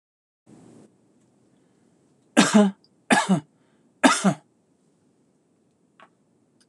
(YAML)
three_cough_length: 6.7 s
three_cough_amplitude: 25611
three_cough_signal_mean_std_ratio: 0.28
survey_phase: alpha (2021-03-01 to 2021-08-12)
age: 45-64
gender: Male
wearing_mask: 'No'
symptom_none: true
smoker_status: Never smoked
respiratory_condition_asthma: false
respiratory_condition_other: false
recruitment_source: REACT
submission_delay: 1 day
covid_test_result: Negative
covid_test_method: RT-qPCR